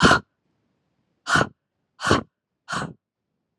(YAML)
exhalation_length: 3.6 s
exhalation_amplitude: 30569
exhalation_signal_mean_std_ratio: 0.32
survey_phase: alpha (2021-03-01 to 2021-08-12)
age: 18-44
gender: Female
wearing_mask: 'No'
symptom_none: true
smoker_status: Never smoked
respiratory_condition_asthma: true
respiratory_condition_other: false
recruitment_source: REACT
submission_delay: 1 day
covid_test_result: Negative
covid_test_method: RT-qPCR